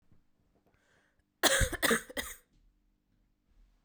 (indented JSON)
{
  "cough_length": "3.8 s",
  "cough_amplitude": 10431,
  "cough_signal_mean_std_ratio": 0.3,
  "survey_phase": "beta (2021-08-13 to 2022-03-07)",
  "age": "18-44",
  "gender": "Female",
  "wearing_mask": "No",
  "symptom_cough_any": true,
  "symptom_new_continuous_cough": true,
  "symptom_runny_or_blocked_nose": true,
  "symptom_shortness_of_breath": true,
  "symptom_fatigue": true,
  "symptom_headache": true,
  "symptom_onset": "2 days",
  "smoker_status": "Never smoked",
  "respiratory_condition_asthma": false,
  "respiratory_condition_other": false,
  "recruitment_source": "Test and Trace",
  "submission_delay": "2 days",
  "covid_test_result": "Positive",
  "covid_test_method": "RT-qPCR",
  "covid_ct_value": 27.4,
  "covid_ct_gene": "ORF1ab gene",
  "covid_ct_mean": 28.0,
  "covid_viral_load": "670 copies/ml",
  "covid_viral_load_category": "Minimal viral load (< 10K copies/ml)"
}